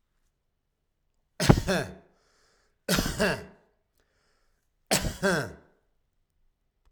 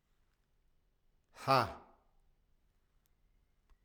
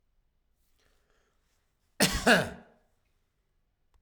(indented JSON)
{
  "three_cough_length": "6.9 s",
  "three_cough_amplitude": 31603,
  "three_cough_signal_mean_std_ratio": 0.32,
  "exhalation_length": "3.8 s",
  "exhalation_amplitude": 5846,
  "exhalation_signal_mean_std_ratio": 0.2,
  "cough_length": "4.0 s",
  "cough_amplitude": 14748,
  "cough_signal_mean_std_ratio": 0.25,
  "survey_phase": "alpha (2021-03-01 to 2021-08-12)",
  "age": "45-64",
  "gender": "Male",
  "wearing_mask": "No",
  "symptom_none": true,
  "smoker_status": "Ex-smoker",
  "respiratory_condition_asthma": false,
  "respiratory_condition_other": false,
  "recruitment_source": "REACT",
  "submission_delay": "1 day",
  "covid_test_result": "Negative",
  "covid_test_method": "RT-qPCR"
}